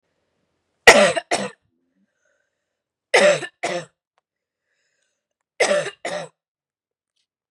three_cough_length: 7.5 s
three_cough_amplitude: 32768
three_cough_signal_mean_std_ratio: 0.28
survey_phase: beta (2021-08-13 to 2022-03-07)
age: 18-44
gender: Female
wearing_mask: 'No'
symptom_cough_any: true
symptom_runny_or_blocked_nose: true
symptom_shortness_of_breath: true
symptom_sore_throat: true
symptom_fatigue: true
symptom_onset: 3 days
smoker_status: Never smoked
respiratory_condition_asthma: false
respiratory_condition_other: false
recruitment_source: Test and Trace
submission_delay: 2 days
covid_test_result: Positive
covid_test_method: RT-qPCR
covid_ct_value: 18.9
covid_ct_gene: ORF1ab gene
covid_ct_mean: 19.4
covid_viral_load: 440000 copies/ml
covid_viral_load_category: Low viral load (10K-1M copies/ml)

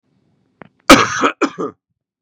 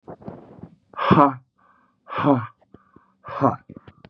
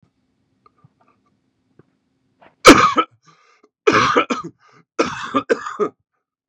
cough_length: 2.2 s
cough_amplitude: 32768
cough_signal_mean_std_ratio: 0.33
exhalation_length: 4.1 s
exhalation_amplitude: 30708
exhalation_signal_mean_std_ratio: 0.35
three_cough_length: 6.5 s
three_cough_amplitude: 32768
three_cough_signal_mean_std_ratio: 0.31
survey_phase: beta (2021-08-13 to 2022-03-07)
age: 45-64
gender: Male
wearing_mask: 'No'
symptom_cough_any: true
symptom_runny_or_blocked_nose: true
symptom_sore_throat: true
symptom_fatigue: true
symptom_headache: true
symptom_onset: 5 days
smoker_status: Never smoked
respiratory_condition_asthma: false
respiratory_condition_other: false
recruitment_source: Test and Trace
submission_delay: 2 days
covid_test_result: Positive
covid_test_method: RT-qPCR
covid_ct_value: 21.8
covid_ct_gene: N gene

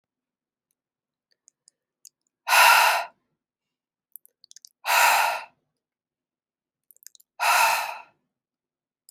exhalation_length: 9.1 s
exhalation_amplitude: 21760
exhalation_signal_mean_std_ratio: 0.33
survey_phase: beta (2021-08-13 to 2022-03-07)
age: 18-44
gender: Female
wearing_mask: 'No'
symptom_cough_any: true
symptom_runny_or_blocked_nose: true
smoker_status: Never smoked
respiratory_condition_asthma: false
respiratory_condition_other: false
recruitment_source: REACT
submission_delay: 2 days
covid_test_result: Negative
covid_test_method: RT-qPCR
influenza_a_test_result: Negative
influenza_b_test_result: Negative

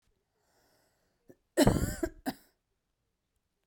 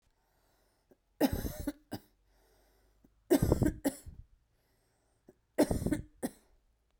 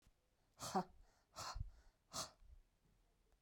cough_length: 3.7 s
cough_amplitude: 9326
cough_signal_mean_std_ratio: 0.25
three_cough_length: 7.0 s
three_cough_amplitude: 8898
three_cough_signal_mean_std_ratio: 0.32
exhalation_length: 3.4 s
exhalation_amplitude: 1155
exhalation_signal_mean_std_ratio: 0.38
survey_phase: beta (2021-08-13 to 2022-03-07)
age: 45-64
gender: Female
wearing_mask: 'No'
symptom_runny_or_blocked_nose: true
symptom_shortness_of_breath: true
symptom_fatigue: true
symptom_fever_high_temperature: true
symptom_headache: true
symptom_change_to_sense_of_smell_or_taste: true
symptom_loss_of_taste: true
symptom_onset: 2 days
smoker_status: Ex-smoker
respiratory_condition_asthma: true
respiratory_condition_other: false
recruitment_source: Test and Trace
submission_delay: 2 days
covid_test_result: Positive
covid_test_method: RT-qPCR
covid_ct_value: 21.5
covid_ct_gene: ORF1ab gene
covid_ct_mean: 22.2
covid_viral_load: 54000 copies/ml
covid_viral_load_category: Low viral load (10K-1M copies/ml)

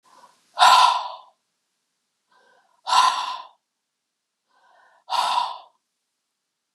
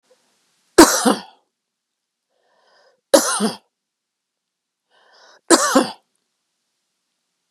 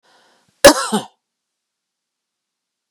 exhalation_length: 6.7 s
exhalation_amplitude: 28104
exhalation_signal_mean_std_ratio: 0.33
three_cough_length: 7.5 s
three_cough_amplitude: 32768
three_cough_signal_mean_std_ratio: 0.26
cough_length: 2.9 s
cough_amplitude: 32768
cough_signal_mean_std_ratio: 0.2
survey_phase: beta (2021-08-13 to 2022-03-07)
age: 45-64
gender: Female
wearing_mask: 'No'
symptom_cough_any: true
symptom_runny_or_blocked_nose: true
symptom_sore_throat: true
symptom_fatigue: true
symptom_headache: true
symptom_onset: 7 days
smoker_status: Ex-smoker
respiratory_condition_asthma: false
respiratory_condition_other: false
recruitment_source: REACT
submission_delay: 3 days
covid_test_result: Negative
covid_test_method: RT-qPCR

